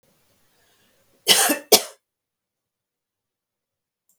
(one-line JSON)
{"cough_length": "4.2 s", "cough_amplitude": 32768, "cough_signal_mean_std_ratio": 0.22, "survey_phase": "beta (2021-08-13 to 2022-03-07)", "age": "65+", "gender": "Female", "wearing_mask": "No", "symptom_none": true, "smoker_status": "Never smoked", "respiratory_condition_asthma": false, "respiratory_condition_other": false, "recruitment_source": "REACT", "submission_delay": "1 day", "covid_test_result": "Negative", "covid_test_method": "RT-qPCR", "influenza_a_test_result": "Negative", "influenza_b_test_result": "Negative"}